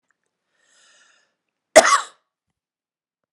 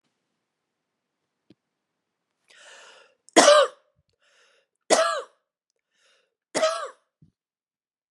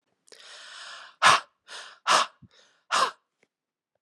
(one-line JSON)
{"cough_length": "3.3 s", "cough_amplitude": 32768, "cough_signal_mean_std_ratio": 0.19, "three_cough_length": "8.1 s", "three_cough_amplitude": 32116, "three_cough_signal_mean_std_ratio": 0.24, "exhalation_length": "4.0 s", "exhalation_amplitude": 21832, "exhalation_signal_mean_std_ratio": 0.32, "survey_phase": "beta (2021-08-13 to 2022-03-07)", "age": "45-64", "gender": "Female", "wearing_mask": "No", "symptom_cough_any": true, "symptom_runny_or_blocked_nose": true, "smoker_status": "Never smoked", "respiratory_condition_asthma": true, "respiratory_condition_other": false, "recruitment_source": "Test and Trace", "submission_delay": "0 days", "covid_test_result": "Positive", "covid_test_method": "LFT"}